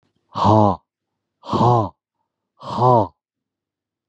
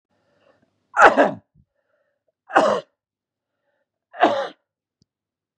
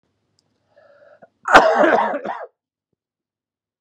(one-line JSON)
{"exhalation_length": "4.1 s", "exhalation_amplitude": 27268, "exhalation_signal_mean_std_ratio": 0.42, "three_cough_length": "5.6 s", "three_cough_amplitude": 32768, "three_cough_signal_mean_std_ratio": 0.28, "cough_length": "3.8 s", "cough_amplitude": 32768, "cough_signal_mean_std_ratio": 0.34, "survey_phase": "beta (2021-08-13 to 2022-03-07)", "age": "45-64", "gender": "Male", "wearing_mask": "No", "symptom_cough_any": true, "symptom_new_continuous_cough": true, "symptom_runny_or_blocked_nose": true, "symptom_shortness_of_breath": true, "symptom_sore_throat": true, "symptom_fatigue": true, "symptom_headache": true, "symptom_onset": "8 days", "smoker_status": "Current smoker (1 to 10 cigarettes per day)", "respiratory_condition_asthma": false, "respiratory_condition_other": false, "recruitment_source": "Test and Trace", "submission_delay": "2 days", "covid_test_result": "Negative", "covid_test_method": "RT-qPCR"}